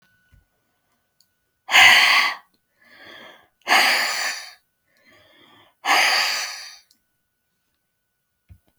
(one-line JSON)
{"exhalation_length": "8.8 s", "exhalation_amplitude": 30855, "exhalation_signal_mean_std_ratio": 0.37, "survey_phase": "beta (2021-08-13 to 2022-03-07)", "age": "65+", "gender": "Female", "wearing_mask": "No", "symptom_fatigue": true, "smoker_status": "Never smoked", "respiratory_condition_asthma": false, "respiratory_condition_other": false, "recruitment_source": "REACT", "submission_delay": "1 day", "covid_test_result": "Negative", "covid_test_method": "RT-qPCR"}